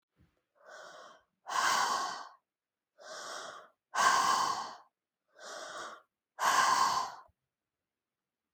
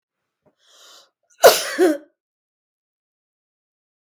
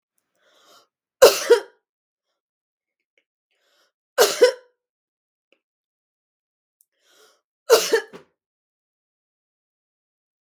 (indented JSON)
{
  "exhalation_length": "8.5 s",
  "exhalation_amplitude": 7076,
  "exhalation_signal_mean_std_ratio": 0.46,
  "cough_length": "4.2 s",
  "cough_amplitude": 32768,
  "cough_signal_mean_std_ratio": 0.23,
  "three_cough_length": "10.4 s",
  "three_cough_amplitude": 32766,
  "three_cough_signal_mean_std_ratio": 0.2,
  "survey_phase": "beta (2021-08-13 to 2022-03-07)",
  "age": "45-64",
  "gender": "Female",
  "wearing_mask": "No",
  "symptom_none": true,
  "smoker_status": "Never smoked",
  "respiratory_condition_asthma": true,
  "respiratory_condition_other": false,
  "recruitment_source": "REACT",
  "submission_delay": "1 day",
  "covid_test_result": "Negative",
  "covid_test_method": "RT-qPCR",
  "influenza_a_test_result": "Unknown/Void",
  "influenza_b_test_result": "Unknown/Void"
}